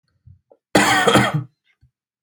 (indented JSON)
{
  "cough_length": "2.2 s",
  "cough_amplitude": 32768,
  "cough_signal_mean_std_ratio": 0.45,
  "survey_phase": "beta (2021-08-13 to 2022-03-07)",
  "age": "18-44",
  "gender": "Male",
  "wearing_mask": "No",
  "symptom_none": true,
  "smoker_status": "Never smoked",
  "respiratory_condition_asthma": false,
  "respiratory_condition_other": false,
  "recruitment_source": "REACT",
  "submission_delay": "0 days",
  "covid_test_result": "Negative",
  "covid_test_method": "RT-qPCR",
  "influenza_a_test_result": "Negative",
  "influenza_b_test_result": "Negative"
}